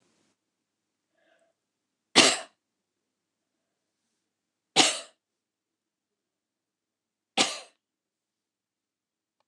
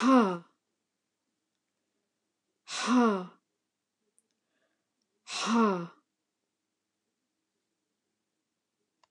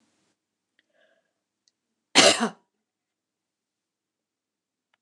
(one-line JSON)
{"three_cough_length": "9.5 s", "three_cough_amplitude": 21810, "three_cough_signal_mean_std_ratio": 0.18, "exhalation_length": "9.1 s", "exhalation_amplitude": 10731, "exhalation_signal_mean_std_ratio": 0.29, "cough_length": "5.0 s", "cough_amplitude": 28996, "cough_signal_mean_std_ratio": 0.18, "survey_phase": "beta (2021-08-13 to 2022-03-07)", "age": "65+", "gender": "Female", "wearing_mask": "No", "symptom_none": true, "smoker_status": "Never smoked", "respiratory_condition_asthma": false, "respiratory_condition_other": false, "recruitment_source": "REACT", "submission_delay": "2 days", "covid_test_result": "Negative", "covid_test_method": "RT-qPCR", "influenza_a_test_result": "Negative", "influenza_b_test_result": "Negative"}